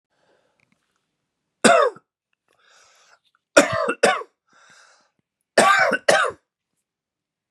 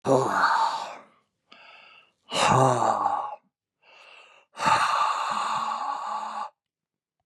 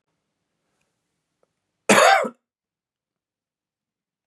{"three_cough_length": "7.5 s", "three_cough_amplitude": 32768, "three_cough_signal_mean_std_ratio": 0.33, "exhalation_length": "7.3 s", "exhalation_amplitude": 17043, "exhalation_signal_mean_std_ratio": 0.59, "cough_length": "4.3 s", "cough_amplitude": 29597, "cough_signal_mean_std_ratio": 0.23, "survey_phase": "beta (2021-08-13 to 2022-03-07)", "age": "45-64", "gender": "Male", "wearing_mask": "No", "symptom_none": true, "smoker_status": "Never smoked", "respiratory_condition_asthma": false, "respiratory_condition_other": false, "recruitment_source": "REACT", "submission_delay": "4 days", "covid_test_result": "Negative", "covid_test_method": "RT-qPCR", "influenza_a_test_result": "Unknown/Void", "influenza_b_test_result": "Unknown/Void"}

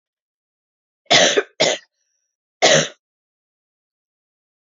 {"three_cough_length": "4.6 s", "three_cough_amplitude": 32767, "three_cough_signal_mean_std_ratio": 0.31, "survey_phase": "beta (2021-08-13 to 2022-03-07)", "age": "18-44", "gender": "Female", "wearing_mask": "No", "symptom_none": true, "smoker_status": "Never smoked", "respiratory_condition_asthma": false, "respiratory_condition_other": false, "recruitment_source": "REACT", "submission_delay": "2 days", "covid_test_result": "Negative", "covid_test_method": "RT-qPCR", "influenza_a_test_result": "Negative", "influenza_b_test_result": "Negative"}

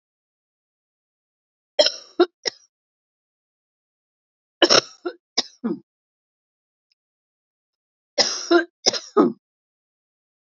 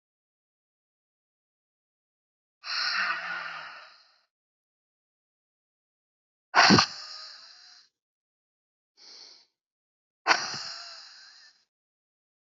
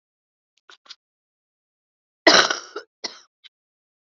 {"three_cough_length": "10.4 s", "three_cough_amplitude": 31717, "three_cough_signal_mean_std_ratio": 0.24, "exhalation_length": "12.5 s", "exhalation_amplitude": 17893, "exhalation_signal_mean_std_ratio": 0.25, "cough_length": "4.2 s", "cough_amplitude": 32372, "cough_signal_mean_std_ratio": 0.2, "survey_phase": "beta (2021-08-13 to 2022-03-07)", "age": "45-64", "gender": "Female", "wearing_mask": "No", "symptom_cough_any": true, "symptom_runny_or_blocked_nose": true, "symptom_sore_throat": true, "symptom_fatigue": true, "symptom_headache": true, "smoker_status": "Current smoker (e-cigarettes or vapes only)", "respiratory_condition_asthma": false, "respiratory_condition_other": false, "recruitment_source": "Test and Trace", "submission_delay": "2 days", "covid_test_result": "Positive", "covid_test_method": "LFT"}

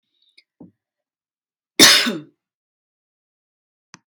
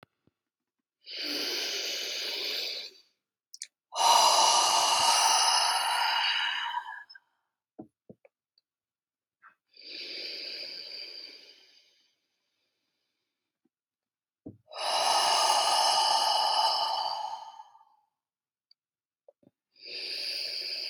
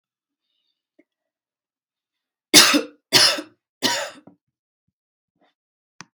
{"cough_length": "4.1 s", "cough_amplitude": 32768, "cough_signal_mean_std_ratio": 0.22, "exhalation_length": "20.9 s", "exhalation_amplitude": 11057, "exhalation_signal_mean_std_ratio": 0.53, "three_cough_length": "6.1 s", "three_cough_amplitude": 32768, "three_cough_signal_mean_std_ratio": 0.25, "survey_phase": "beta (2021-08-13 to 2022-03-07)", "age": "18-44", "gender": "Female", "wearing_mask": "No", "symptom_cough_any": true, "symptom_sore_throat": true, "symptom_other": true, "symptom_onset": "8 days", "smoker_status": "Never smoked", "respiratory_condition_asthma": false, "respiratory_condition_other": false, "recruitment_source": "Test and Trace", "submission_delay": "4 days", "covid_test_result": "Positive", "covid_test_method": "RT-qPCR", "covid_ct_value": 26.1, "covid_ct_gene": "N gene"}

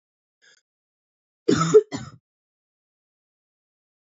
{"cough_length": "4.2 s", "cough_amplitude": 21836, "cough_signal_mean_std_ratio": 0.21, "survey_phase": "beta (2021-08-13 to 2022-03-07)", "age": "18-44", "gender": "Female", "wearing_mask": "No", "symptom_cough_any": true, "symptom_new_continuous_cough": true, "symptom_runny_or_blocked_nose": true, "symptom_shortness_of_breath": true, "symptom_sore_throat": true, "symptom_onset": "3 days", "smoker_status": "Never smoked", "respiratory_condition_asthma": false, "respiratory_condition_other": false, "recruitment_source": "Test and Trace", "submission_delay": "2 days", "covid_test_result": "Positive", "covid_test_method": "ePCR"}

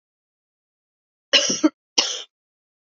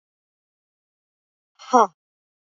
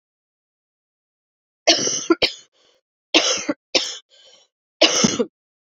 {"cough_length": "2.9 s", "cough_amplitude": 27612, "cough_signal_mean_std_ratio": 0.29, "exhalation_length": "2.5 s", "exhalation_amplitude": 26864, "exhalation_signal_mean_std_ratio": 0.17, "three_cough_length": "5.6 s", "three_cough_amplitude": 32768, "three_cough_signal_mean_std_ratio": 0.36, "survey_phase": "beta (2021-08-13 to 2022-03-07)", "age": "45-64", "gender": "Female", "wearing_mask": "No", "symptom_cough_any": true, "symptom_runny_or_blocked_nose": true, "symptom_fatigue": true, "symptom_fever_high_temperature": true, "symptom_headache": true, "symptom_other": true, "smoker_status": "Never smoked", "respiratory_condition_asthma": false, "respiratory_condition_other": false, "recruitment_source": "Test and Trace", "submission_delay": "2 days", "covid_test_result": "Positive", "covid_test_method": "RT-qPCR", "covid_ct_value": 21.8, "covid_ct_gene": "ORF1ab gene"}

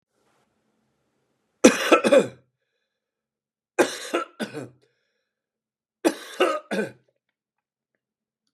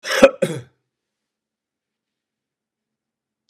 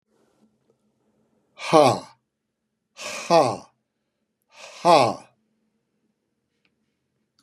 {"three_cough_length": "8.5 s", "three_cough_amplitude": 32767, "three_cough_signal_mean_std_ratio": 0.27, "cough_length": "3.5 s", "cough_amplitude": 32768, "cough_signal_mean_std_ratio": 0.2, "exhalation_length": "7.4 s", "exhalation_amplitude": 28069, "exhalation_signal_mean_std_ratio": 0.26, "survey_phase": "beta (2021-08-13 to 2022-03-07)", "age": "65+", "gender": "Male", "wearing_mask": "No", "symptom_fatigue": true, "symptom_onset": "4 days", "smoker_status": "Ex-smoker", "respiratory_condition_asthma": false, "respiratory_condition_other": false, "recruitment_source": "REACT", "submission_delay": "2 days", "covid_test_result": "Negative", "covid_test_method": "RT-qPCR", "influenza_a_test_result": "Negative", "influenza_b_test_result": "Negative"}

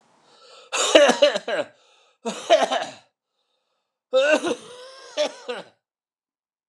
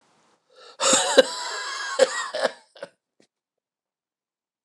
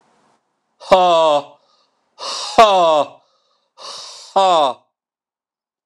{"three_cough_length": "6.7 s", "three_cough_amplitude": 29203, "three_cough_signal_mean_std_ratio": 0.4, "cough_length": "4.6 s", "cough_amplitude": 29204, "cough_signal_mean_std_ratio": 0.36, "exhalation_length": "5.9 s", "exhalation_amplitude": 29204, "exhalation_signal_mean_std_ratio": 0.43, "survey_phase": "beta (2021-08-13 to 2022-03-07)", "age": "45-64", "gender": "Male", "wearing_mask": "No", "symptom_cough_any": true, "symptom_new_continuous_cough": true, "symptom_runny_or_blocked_nose": true, "symptom_shortness_of_breath": true, "symptom_fatigue": true, "symptom_fever_high_temperature": true, "symptom_headache": true, "symptom_onset": "9 days", "smoker_status": "Ex-smoker", "respiratory_condition_asthma": false, "respiratory_condition_other": false, "recruitment_source": "Test and Trace", "submission_delay": "1 day", "covid_test_result": "Positive", "covid_test_method": "RT-qPCR", "covid_ct_value": 29.2, "covid_ct_gene": "ORF1ab gene", "covid_ct_mean": 29.7, "covid_viral_load": "180 copies/ml", "covid_viral_load_category": "Minimal viral load (< 10K copies/ml)"}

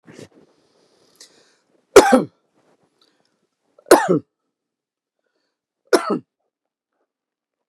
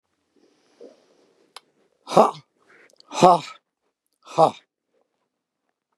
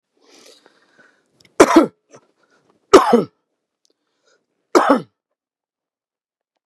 {"three_cough_length": "7.7 s", "three_cough_amplitude": 32768, "three_cough_signal_mean_std_ratio": 0.21, "exhalation_length": "6.0 s", "exhalation_amplitude": 32768, "exhalation_signal_mean_std_ratio": 0.21, "cough_length": "6.7 s", "cough_amplitude": 32768, "cough_signal_mean_std_ratio": 0.25, "survey_phase": "beta (2021-08-13 to 2022-03-07)", "age": "65+", "gender": "Male", "wearing_mask": "No", "symptom_none": true, "smoker_status": "Never smoked", "respiratory_condition_asthma": false, "respiratory_condition_other": false, "recruitment_source": "REACT", "submission_delay": "2 days", "covid_test_result": "Negative", "covid_test_method": "RT-qPCR", "influenza_a_test_result": "Negative", "influenza_b_test_result": "Negative"}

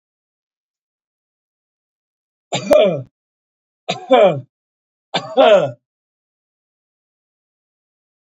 {"three_cough_length": "8.3 s", "three_cough_amplitude": 27065, "three_cough_signal_mean_std_ratio": 0.29, "survey_phase": "beta (2021-08-13 to 2022-03-07)", "age": "45-64", "gender": "Male", "wearing_mask": "No", "symptom_none": true, "smoker_status": "Never smoked", "respiratory_condition_asthma": false, "respiratory_condition_other": false, "recruitment_source": "REACT", "submission_delay": "2 days", "covid_test_result": "Negative", "covid_test_method": "RT-qPCR", "influenza_a_test_result": "Unknown/Void", "influenza_b_test_result": "Unknown/Void"}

